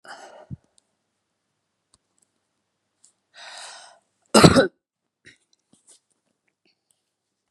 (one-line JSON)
{"cough_length": "7.5 s", "cough_amplitude": 32767, "cough_signal_mean_std_ratio": 0.17, "survey_phase": "beta (2021-08-13 to 2022-03-07)", "age": "65+", "gender": "Female", "wearing_mask": "No", "symptom_none": true, "smoker_status": "Never smoked", "respiratory_condition_asthma": false, "respiratory_condition_other": false, "recruitment_source": "REACT", "submission_delay": "3 days", "covid_test_result": "Negative", "covid_test_method": "RT-qPCR", "influenza_a_test_result": "Negative", "influenza_b_test_result": "Negative"}